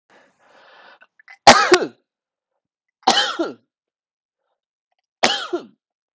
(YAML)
three_cough_length: 6.1 s
three_cough_amplitude: 32768
three_cough_signal_mean_std_ratio: 0.27
survey_phase: alpha (2021-03-01 to 2021-08-12)
age: 45-64
gender: Male
wearing_mask: 'No'
symptom_shortness_of_breath: true
symptom_fatigue: true
symptom_fever_high_temperature: true
symptom_headache: true
symptom_change_to_sense_of_smell_or_taste: true
symptom_onset: 3 days
smoker_status: Never smoked
respiratory_condition_asthma: true
respiratory_condition_other: false
recruitment_source: Test and Trace
submission_delay: 2 days
covid_test_result: Positive
covid_test_method: RT-qPCR
covid_ct_value: 12.9
covid_ct_gene: ORF1ab gene
covid_ct_mean: 13.6
covid_viral_load: 36000000 copies/ml
covid_viral_load_category: High viral load (>1M copies/ml)